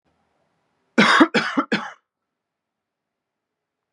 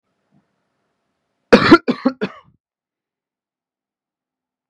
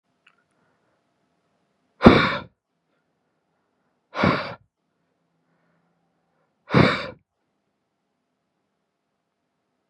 {
  "three_cough_length": "3.9 s",
  "three_cough_amplitude": 29811,
  "three_cough_signal_mean_std_ratio": 0.3,
  "cough_length": "4.7 s",
  "cough_amplitude": 32768,
  "cough_signal_mean_std_ratio": 0.21,
  "exhalation_length": "9.9 s",
  "exhalation_amplitude": 32768,
  "exhalation_signal_mean_std_ratio": 0.21,
  "survey_phase": "beta (2021-08-13 to 2022-03-07)",
  "age": "18-44",
  "gender": "Male",
  "wearing_mask": "No",
  "symptom_none": true,
  "smoker_status": "Current smoker (e-cigarettes or vapes only)",
  "respiratory_condition_asthma": false,
  "respiratory_condition_other": false,
  "recruitment_source": "REACT",
  "submission_delay": "1 day",
  "covid_test_result": "Negative",
  "covid_test_method": "RT-qPCR"
}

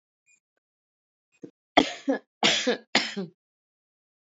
{
  "three_cough_length": "4.3 s",
  "three_cough_amplitude": 26562,
  "three_cough_signal_mean_std_ratio": 0.31,
  "survey_phase": "beta (2021-08-13 to 2022-03-07)",
  "age": "45-64",
  "gender": "Female",
  "wearing_mask": "No",
  "symptom_new_continuous_cough": true,
  "symptom_onset": "4 days",
  "smoker_status": "Never smoked",
  "respiratory_condition_asthma": false,
  "respiratory_condition_other": false,
  "recruitment_source": "Test and Trace",
  "submission_delay": "2 days",
  "covid_test_result": "Negative",
  "covid_test_method": "RT-qPCR"
}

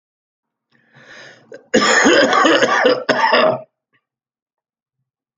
{
  "cough_length": "5.4 s",
  "cough_amplitude": 31083,
  "cough_signal_mean_std_ratio": 0.5,
  "survey_phase": "alpha (2021-03-01 to 2021-08-12)",
  "age": "65+",
  "gender": "Male",
  "wearing_mask": "No",
  "symptom_fatigue": true,
  "symptom_headache": true,
  "symptom_change_to_sense_of_smell_or_taste": true,
  "smoker_status": "Never smoked",
  "respiratory_condition_asthma": false,
  "respiratory_condition_other": false,
  "recruitment_source": "Test and Trace",
  "submission_delay": "2 days",
  "covid_test_result": "Positive",
  "covid_test_method": "LFT"
}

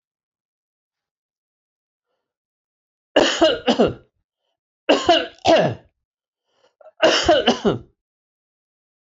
{
  "three_cough_length": "9.0 s",
  "three_cough_amplitude": 25544,
  "three_cough_signal_mean_std_ratio": 0.36,
  "survey_phase": "beta (2021-08-13 to 2022-03-07)",
  "age": "65+",
  "gender": "Male",
  "wearing_mask": "No",
  "symptom_none": true,
  "smoker_status": "Ex-smoker",
  "respiratory_condition_asthma": false,
  "respiratory_condition_other": false,
  "recruitment_source": "REACT",
  "submission_delay": "1 day",
  "covid_test_result": "Negative",
  "covid_test_method": "RT-qPCR"
}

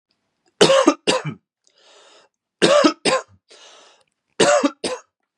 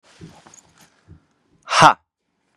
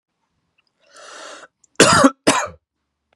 {
  "three_cough_length": "5.4 s",
  "three_cough_amplitude": 32622,
  "three_cough_signal_mean_std_ratio": 0.4,
  "exhalation_length": "2.6 s",
  "exhalation_amplitude": 32768,
  "exhalation_signal_mean_std_ratio": 0.22,
  "cough_length": "3.2 s",
  "cough_amplitude": 32768,
  "cough_signal_mean_std_ratio": 0.32,
  "survey_phase": "beta (2021-08-13 to 2022-03-07)",
  "age": "18-44",
  "gender": "Male",
  "wearing_mask": "No",
  "symptom_none": true,
  "smoker_status": "Ex-smoker",
  "respiratory_condition_asthma": false,
  "respiratory_condition_other": false,
  "recruitment_source": "REACT",
  "submission_delay": "0 days",
  "covid_test_result": "Negative",
  "covid_test_method": "RT-qPCR",
  "influenza_a_test_result": "Negative",
  "influenza_b_test_result": "Negative"
}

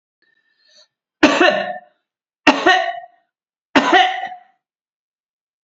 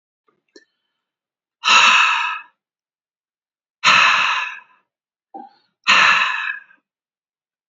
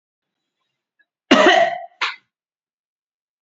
{
  "three_cough_length": "5.6 s",
  "three_cough_amplitude": 32309,
  "three_cough_signal_mean_std_ratio": 0.38,
  "exhalation_length": "7.7 s",
  "exhalation_amplitude": 32768,
  "exhalation_signal_mean_std_ratio": 0.41,
  "cough_length": "3.4 s",
  "cough_amplitude": 28668,
  "cough_signal_mean_std_ratio": 0.31,
  "survey_phase": "beta (2021-08-13 to 2022-03-07)",
  "age": "65+",
  "gender": "Male",
  "wearing_mask": "No",
  "symptom_none": true,
  "smoker_status": "Never smoked",
  "respiratory_condition_asthma": false,
  "respiratory_condition_other": false,
  "recruitment_source": "REACT",
  "submission_delay": "1 day",
  "covid_test_result": "Negative",
  "covid_test_method": "RT-qPCR",
  "influenza_a_test_result": "Unknown/Void",
  "influenza_b_test_result": "Unknown/Void"
}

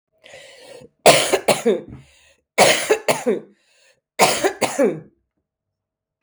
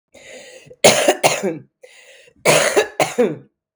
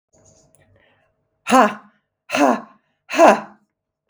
{
  "three_cough_length": "6.2 s",
  "three_cough_amplitude": 32768,
  "three_cough_signal_mean_std_ratio": 0.42,
  "cough_length": "3.8 s",
  "cough_amplitude": 32768,
  "cough_signal_mean_std_ratio": 0.47,
  "exhalation_length": "4.1 s",
  "exhalation_amplitude": 32766,
  "exhalation_signal_mean_std_ratio": 0.32,
  "survey_phase": "beta (2021-08-13 to 2022-03-07)",
  "age": "45-64",
  "gender": "Female",
  "wearing_mask": "No",
  "symptom_cough_any": true,
  "symptom_sore_throat": true,
  "symptom_fatigue": true,
  "symptom_headache": true,
  "symptom_other": true,
  "symptom_onset": "2 days",
  "smoker_status": "Never smoked",
  "respiratory_condition_asthma": false,
  "respiratory_condition_other": false,
  "recruitment_source": "Test and Trace",
  "submission_delay": "2 days",
  "covid_test_result": "Positive",
  "covid_test_method": "RT-qPCR",
  "covid_ct_value": 23.2,
  "covid_ct_gene": "ORF1ab gene",
  "covid_ct_mean": 24.0,
  "covid_viral_load": "14000 copies/ml",
  "covid_viral_load_category": "Low viral load (10K-1M copies/ml)"
}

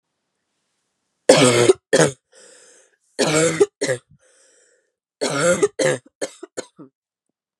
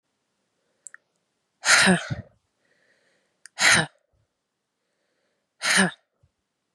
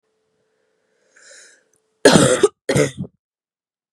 {
  "three_cough_length": "7.6 s",
  "three_cough_amplitude": 32768,
  "three_cough_signal_mean_std_ratio": 0.38,
  "exhalation_length": "6.7 s",
  "exhalation_amplitude": 23017,
  "exhalation_signal_mean_std_ratio": 0.29,
  "cough_length": "3.9 s",
  "cough_amplitude": 32768,
  "cough_signal_mean_std_ratio": 0.31,
  "survey_phase": "beta (2021-08-13 to 2022-03-07)",
  "age": "18-44",
  "gender": "Female",
  "wearing_mask": "No",
  "symptom_cough_any": true,
  "symptom_new_continuous_cough": true,
  "symptom_runny_or_blocked_nose": true,
  "symptom_shortness_of_breath": true,
  "symptom_sore_throat": true,
  "symptom_fatigue": true,
  "symptom_fever_high_temperature": true,
  "symptom_headache": true,
  "symptom_change_to_sense_of_smell_or_taste": true,
  "symptom_loss_of_taste": true,
  "symptom_onset": "4 days",
  "smoker_status": "Never smoked",
  "respiratory_condition_asthma": false,
  "respiratory_condition_other": false,
  "recruitment_source": "Test and Trace",
  "submission_delay": "2 days",
  "covid_test_result": "Positive",
  "covid_test_method": "ePCR"
}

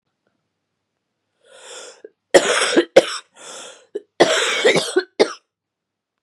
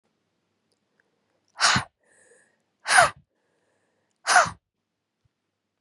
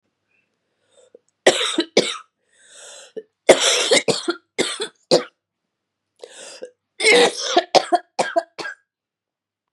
{
  "cough_length": "6.2 s",
  "cough_amplitude": 32768,
  "cough_signal_mean_std_ratio": 0.36,
  "exhalation_length": "5.8 s",
  "exhalation_amplitude": 24779,
  "exhalation_signal_mean_std_ratio": 0.25,
  "three_cough_length": "9.7 s",
  "three_cough_amplitude": 32768,
  "three_cough_signal_mean_std_ratio": 0.37,
  "survey_phase": "beta (2021-08-13 to 2022-03-07)",
  "age": "18-44",
  "gender": "Female",
  "wearing_mask": "No",
  "symptom_cough_any": true,
  "symptom_runny_or_blocked_nose": true,
  "symptom_shortness_of_breath": true,
  "symptom_sore_throat": true,
  "symptom_fatigue": true,
  "symptom_headache": true,
  "symptom_change_to_sense_of_smell_or_taste": true,
  "symptom_loss_of_taste": true,
  "symptom_onset": "4 days",
  "smoker_status": "Ex-smoker",
  "respiratory_condition_asthma": true,
  "respiratory_condition_other": false,
  "recruitment_source": "Test and Trace",
  "submission_delay": "2 days",
  "covid_test_result": "Positive",
  "covid_test_method": "RT-qPCR",
  "covid_ct_value": 15.5,
  "covid_ct_gene": "ORF1ab gene",
  "covid_ct_mean": 15.6,
  "covid_viral_load": "7400000 copies/ml",
  "covid_viral_load_category": "High viral load (>1M copies/ml)"
}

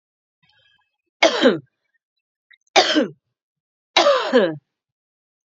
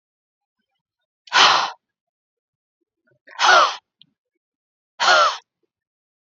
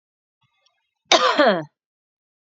{
  "three_cough_length": "5.5 s",
  "three_cough_amplitude": 28862,
  "three_cough_signal_mean_std_ratio": 0.35,
  "exhalation_length": "6.3 s",
  "exhalation_amplitude": 30727,
  "exhalation_signal_mean_std_ratio": 0.32,
  "cough_length": "2.6 s",
  "cough_amplitude": 32768,
  "cough_signal_mean_std_ratio": 0.33,
  "survey_phase": "beta (2021-08-13 to 2022-03-07)",
  "age": "45-64",
  "gender": "Female",
  "wearing_mask": "No",
  "symptom_fatigue": true,
  "smoker_status": "Never smoked",
  "respiratory_condition_asthma": false,
  "respiratory_condition_other": false,
  "recruitment_source": "REACT",
  "submission_delay": "3 days",
  "covid_test_result": "Negative",
  "covid_test_method": "RT-qPCR",
  "influenza_a_test_result": "Negative",
  "influenza_b_test_result": "Negative"
}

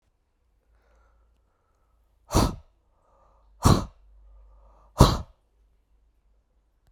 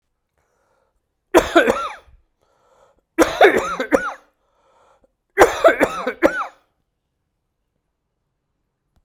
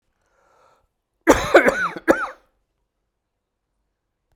{
  "exhalation_length": "6.9 s",
  "exhalation_amplitude": 32768,
  "exhalation_signal_mean_std_ratio": 0.22,
  "three_cough_length": "9.0 s",
  "three_cough_amplitude": 32768,
  "three_cough_signal_mean_std_ratio": 0.32,
  "cough_length": "4.4 s",
  "cough_amplitude": 32768,
  "cough_signal_mean_std_ratio": 0.28,
  "survey_phase": "beta (2021-08-13 to 2022-03-07)",
  "age": "45-64",
  "gender": "Male",
  "wearing_mask": "No",
  "symptom_cough_any": true,
  "smoker_status": "Never smoked",
  "respiratory_condition_asthma": false,
  "respiratory_condition_other": false,
  "recruitment_source": "REACT",
  "submission_delay": "2 days",
  "covid_test_result": "Negative",
  "covid_test_method": "RT-qPCR"
}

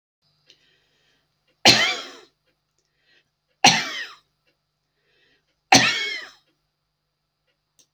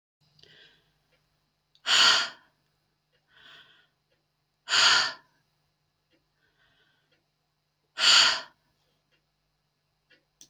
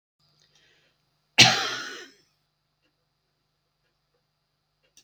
{
  "three_cough_length": "7.9 s",
  "three_cough_amplitude": 32768,
  "three_cough_signal_mean_std_ratio": 0.25,
  "exhalation_length": "10.5 s",
  "exhalation_amplitude": 17936,
  "exhalation_signal_mean_std_ratio": 0.27,
  "cough_length": "5.0 s",
  "cough_amplitude": 27393,
  "cough_signal_mean_std_ratio": 0.19,
  "survey_phase": "beta (2021-08-13 to 2022-03-07)",
  "age": "65+",
  "gender": "Female",
  "wearing_mask": "No",
  "symptom_none": true,
  "smoker_status": "Never smoked",
  "respiratory_condition_asthma": false,
  "respiratory_condition_other": false,
  "recruitment_source": "REACT",
  "submission_delay": "1 day",
  "covid_test_result": "Negative",
  "covid_test_method": "RT-qPCR"
}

